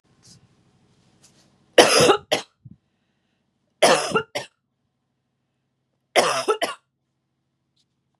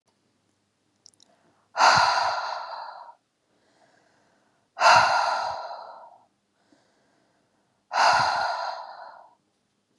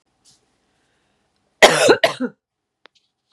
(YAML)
three_cough_length: 8.2 s
three_cough_amplitude: 32768
three_cough_signal_mean_std_ratio: 0.29
exhalation_length: 10.0 s
exhalation_amplitude: 20916
exhalation_signal_mean_std_ratio: 0.4
cough_length: 3.3 s
cough_amplitude: 32768
cough_signal_mean_std_ratio: 0.28
survey_phase: beta (2021-08-13 to 2022-03-07)
age: 18-44
gender: Female
wearing_mask: 'No'
symptom_none: true
symptom_onset: 13 days
smoker_status: Never smoked
respiratory_condition_asthma: false
respiratory_condition_other: false
recruitment_source: REACT
submission_delay: 2 days
covid_test_result: Negative
covid_test_method: RT-qPCR
influenza_a_test_result: Negative
influenza_b_test_result: Negative